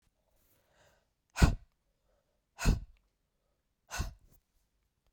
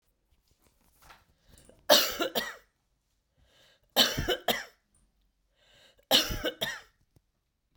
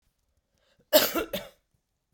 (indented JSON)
{
  "exhalation_length": "5.1 s",
  "exhalation_amplitude": 11494,
  "exhalation_signal_mean_std_ratio": 0.21,
  "three_cough_length": "7.8 s",
  "three_cough_amplitude": 18580,
  "three_cough_signal_mean_std_ratio": 0.31,
  "cough_length": "2.1 s",
  "cough_amplitude": 20657,
  "cough_signal_mean_std_ratio": 0.29,
  "survey_phase": "beta (2021-08-13 to 2022-03-07)",
  "age": "45-64",
  "gender": "Female",
  "wearing_mask": "No",
  "symptom_runny_or_blocked_nose": true,
  "smoker_status": "Ex-smoker",
  "respiratory_condition_asthma": true,
  "respiratory_condition_other": false,
  "recruitment_source": "REACT",
  "submission_delay": "1 day",
  "covid_test_result": "Negative",
  "covid_test_method": "RT-qPCR",
  "influenza_a_test_result": "Negative",
  "influenza_b_test_result": "Negative"
}